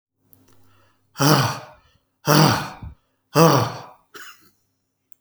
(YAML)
exhalation_length: 5.2 s
exhalation_amplitude: 32405
exhalation_signal_mean_std_ratio: 0.38
survey_phase: beta (2021-08-13 to 2022-03-07)
age: 45-64
gender: Male
wearing_mask: 'No'
symptom_none: true
smoker_status: Ex-smoker
respiratory_condition_asthma: false
respiratory_condition_other: false
recruitment_source: REACT
submission_delay: 0 days
covid_test_result: Negative
covid_test_method: RT-qPCR